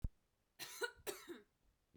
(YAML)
cough_length: 2.0 s
cough_amplitude: 1422
cough_signal_mean_std_ratio: 0.38
survey_phase: beta (2021-08-13 to 2022-03-07)
age: 18-44
gender: Female
wearing_mask: 'No'
symptom_none: true
symptom_onset: 13 days
smoker_status: Never smoked
respiratory_condition_asthma: false
respiratory_condition_other: false
recruitment_source: REACT
submission_delay: 1 day
covid_test_result: Negative
covid_test_method: RT-qPCR
influenza_a_test_result: Negative
influenza_b_test_result: Negative